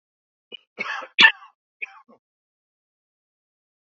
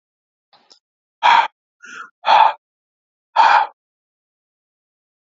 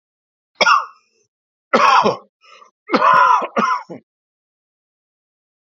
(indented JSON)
{
  "cough_length": "3.8 s",
  "cough_amplitude": 30500,
  "cough_signal_mean_std_ratio": 0.18,
  "exhalation_length": "5.4 s",
  "exhalation_amplitude": 32292,
  "exhalation_signal_mean_std_ratio": 0.32,
  "three_cough_length": "5.6 s",
  "three_cough_amplitude": 28780,
  "three_cough_signal_mean_std_ratio": 0.42,
  "survey_phase": "alpha (2021-03-01 to 2021-08-12)",
  "age": "65+",
  "gender": "Male",
  "wearing_mask": "No",
  "symptom_none": true,
  "smoker_status": "Never smoked",
  "respiratory_condition_asthma": false,
  "respiratory_condition_other": false,
  "recruitment_source": "REACT",
  "submission_delay": "1 day",
  "covid_test_result": "Negative",
  "covid_test_method": "RT-qPCR"
}